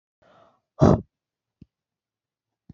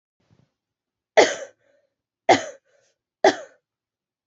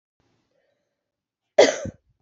{"exhalation_length": "2.7 s", "exhalation_amplitude": 24019, "exhalation_signal_mean_std_ratio": 0.2, "three_cough_length": "4.3 s", "three_cough_amplitude": 27495, "three_cough_signal_mean_std_ratio": 0.22, "cough_length": "2.2 s", "cough_amplitude": 26163, "cough_signal_mean_std_ratio": 0.21, "survey_phase": "beta (2021-08-13 to 2022-03-07)", "age": "18-44", "gender": "Female", "wearing_mask": "No", "symptom_cough_any": true, "symptom_runny_or_blocked_nose": true, "symptom_shortness_of_breath": true, "symptom_abdominal_pain": true, "symptom_diarrhoea": true, "symptom_headache": true, "symptom_other": true, "smoker_status": "Never smoked", "respiratory_condition_asthma": false, "respiratory_condition_other": false, "recruitment_source": "Test and Trace", "submission_delay": "1 day", "covid_test_result": "Positive", "covid_test_method": "LFT"}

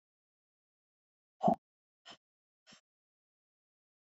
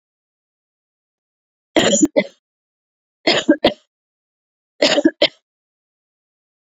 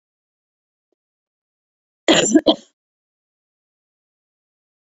{"exhalation_length": "4.0 s", "exhalation_amplitude": 5473, "exhalation_signal_mean_std_ratio": 0.14, "three_cough_length": "6.7 s", "three_cough_amplitude": 30897, "three_cough_signal_mean_std_ratio": 0.29, "cough_length": "4.9 s", "cough_amplitude": 29143, "cough_signal_mean_std_ratio": 0.21, "survey_phase": "beta (2021-08-13 to 2022-03-07)", "age": "45-64", "gender": "Female", "wearing_mask": "No", "symptom_cough_any": true, "symptom_change_to_sense_of_smell_or_taste": true, "symptom_onset": "4 days", "smoker_status": "Never smoked", "respiratory_condition_asthma": false, "respiratory_condition_other": false, "recruitment_source": "REACT", "submission_delay": "1 day", "covid_test_result": "Negative", "covid_test_method": "RT-qPCR"}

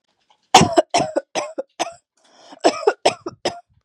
{"cough_length": "3.8 s", "cough_amplitude": 32768, "cough_signal_mean_std_ratio": 0.36, "survey_phase": "beta (2021-08-13 to 2022-03-07)", "age": "18-44", "gender": "Female", "wearing_mask": "No", "symptom_cough_any": true, "symptom_runny_or_blocked_nose": true, "symptom_sore_throat": true, "symptom_fatigue": true, "symptom_fever_high_temperature": true, "smoker_status": "Never smoked", "respiratory_condition_asthma": false, "respiratory_condition_other": false, "recruitment_source": "Test and Trace", "submission_delay": "2 days", "covid_test_result": "Positive", "covid_test_method": "RT-qPCR", "covid_ct_value": 16.5, "covid_ct_gene": "ORF1ab gene"}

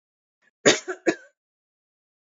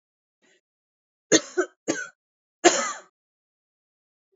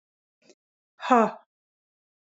{"cough_length": "2.4 s", "cough_amplitude": 22857, "cough_signal_mean_std_ratio": 0.23, "three_cough_length": "4.4 s", "three_cough_amplitude": 25585, "three_cough_signal_mean_std_ratio": 0.25, "exhalation_length": "2.2 s", "exhalation_amplitude": 21012, "exhalation_signal_mean_std_ratio": 0.23, "survey_phase": "alpha (2021-03-01 to 2021-08-12)", "age": "18-44", "gender": "Female", "wearing_mask": "Yes", "symptom_none": true, "smoker_status": "Ex-smoker", "respiratory_condition_asthma": false, "respiratory_condition_other": false, "recruitment_source": "Test and Trace", "submission_delay": "0 days", "covid_test_result": "Negative", "covid_test_method": "LFT"}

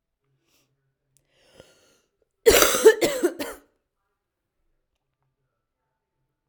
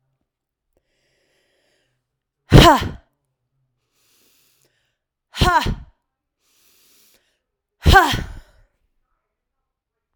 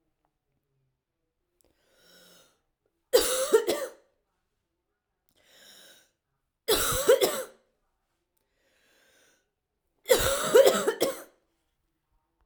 {"cough_length": "6.5 s", "cough_amplitude": 32767, "cough_signal_mean_std_ratio": 0.25, "exhalation_length": "10.2 s", "exhalation_amplitude": 32768, "exhalation_signal_mean_std_ratio": 0.24, "three_cough_length": "12.5 s", "three_cough_amplitude": 16589, "three_cough_signal_mean_std_ratio": 0.31, "survey_phase": "alpha (2021-03-01 to 2021-08-12)", "age": "18-44", "gender": "Female", "wearing_mask": "No", "symptom_cough_any": true, "symptom_headache": true, "smoker_status": "Never smoked", "respiratory_condition_asthma": false, "respiratory_condition_other": false, "recruitment_source": "Test and Trace", "submission_delay": "1 day", "covid_test_result": "Positive", "covid_test_method": "RT-qPCR"}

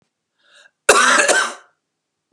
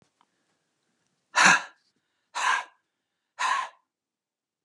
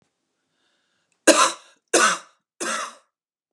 {"cough_length": "2.3 s", "cough_amplitude": 32768, "cough_signal_mean_std_ratio": 0.42, "exhalation_length": "4.6 s", "exhalation_amplitude": 22752, "exhalation_signal_mean_std_ratio": 0.3, "three_cough_length": "3.5 s", "three_cough_amplitude": 32767, "three_cough_signal_mean_std_ratio": 0.32, "survey_phase": "beta (2021-08-13 to 2022-03-07)", "age": "18-44", "gender": "Male", "wearing_mask": "No", "symptom_none": true, "symptom_onset": "12 days", "smoker_status": "Never smoked", "respiratory_condition_asthma": false, "respiratory_condition_other": false, "recruitment_source": "REACT", "submission_delay": "0 days", "covid_test_result": "Negative", "covid_test_method": "RT-qPCR", "influenza_a_test_result": "Negative", "influenza_b_test_result": "Negative"}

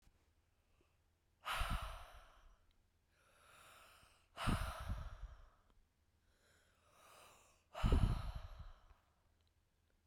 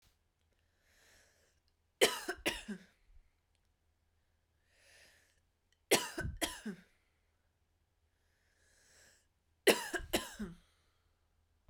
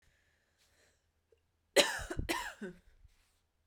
{"exhalation_length": "10.1 s", "exhalation_amplitude": 2600, "exhalation_signal_mean_std_ratio": 0.34, "three_cough_length": "11.7 s", "three_cough_amplitude": 7946, "three_cough_signal_mean_std_ratio": 0.24, "cough_length": "3.7 s", "cough_amplitude": 10597, "cough_signal_mean_std_ratio": 0.28, "survey_phase": "beta (2021-08-13 to 2022-03-07)", "age": "18-44", "gender": "Female", "wearing_mask": "No", "symptom_none": true, "smoker_status": "Never smoked", "respiratory_condition_asthma": true, "respiratory_condition_other": false, "recruitment_source": "REACT", "submission_delay": "1 day", "covid_test_result": "Negative", "covid_test_method": "RT-qPCR", "influenza_a_test_result": "Negative", "influenza_b_test_result": "Negative"}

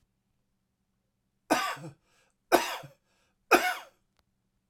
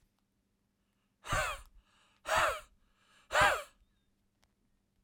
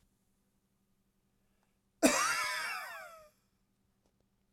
{"three_cough_length": "4.7 s", "three_cough_amplitude": 15241, "three_cough_signal_mean_std_ratio": 0.27, "exhalation_length": "5.0 s", "exhalation_amplitude": 6429, "exhalation_signal_mean_std_ratio": 0.33, "cough_length": "4.5 s", "cough_amplitude": 9246, "cough_signal_mean_std_ratio": 0.33, "survey_phase": "beta (2021-08-13 to 2022-03-07)", "age": "45-64", "gender": "Male", "wearing_mask": "No", "symptom_cough_any": true, "symptom_runny_or_blocked_nose": true, "symptom_sore_throat": true, "symptom_fatigue": true, "symptom_headache": true, "smoker_status": "Ex-smoker", "respiratory_condition_asthma": false, "respiratory_condition_other": false, "recruitment_source": "Test and Trace", "submission_delay": "1 day", "covid_test_result": "Positive", "covid_test_method": "RT-qPCR"}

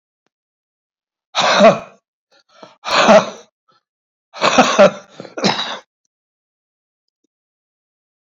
{"exhalation_length": "8.3 s", "exhalation_amplitude": 29478, "exhalation_signal_mean_std_ratio": 0.33, "survey_phase": "beta (2021-08-13 to 2022-03-07)", "age": "65+", "gender": "Male", "wearing_mask": "No", "symptom_cough_any": true, "symptom_runny_or_blocked_nose": true, "symptom_onset": "11 days", "smoker_status": "Ex-smoker", "respiratory_condition_asthma": true, "respiratory_condition_other": false, "recruitment_source": "REACT", "submission_delay": "2 days", "covid_test_result": "Positive", "covid_test_method": "RT-qPCR", "covid_ct_value": 26.6, "covid_ct_gene": "E gene", "influenza_a_test_result": "Negative", "influenza_b_test_result": "Negative"}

